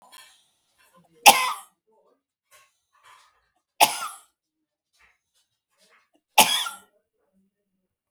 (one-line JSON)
{"three_cough_length": "8.1 s", "three_cough_amplitude": 32768, "three_cough_signal_mean_std_ratio": 0.2, "survey_phase": "beta (2021-08-13 to 2022-03-07)", "age": "45-64", "gender": "Female", "wearing_mask": "No", "symptom_cough_any": true, "symptom_runny_or_blocked_nose": true, "symptom_headache": true, "symptom_onset": "12 days", "smoker_status": "Never smoked", "respiratory_condition_asthma": true, "respiratory_condition_other": false, "recruitment_source": "REACT", "submission_delay": "0 days", "covid_test_result": "Negative", "covid_test_method": "RT-qPCR", "influenza_a_test_result": "Unknown/Void", "influenza_b_test_result": "Unknown/Void"}